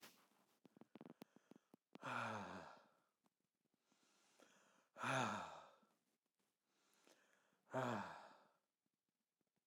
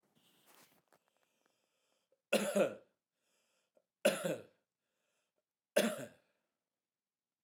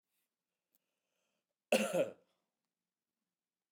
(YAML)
exhalation_length: 9.7 s
exhalation_amplitude: 1137
exhalation_signal_mean_std_ratio: 0.35
three_cough_length: 7.4 s
three_cough_amplitude: 4412
three_cough_signal_mean_std_ratio: 0.26
cough_length: 3.7 s
cough_amplitude: 4521
cough_signal_mean_std_ratio: 0.23
survey_phase: beta (2021-08-13 to 2022-03-07)
age: 45-64
gender: Male
wearing_mask: 'No'
symptom_none: true
smoker_status: Ex-smoker
respiratory_condition_asthma: false
respiratory_condition_other: false
recruitment_source: REACT
submission_delay: 2 days
covid_test_result: Negative
covid_test_method: RT-qPCR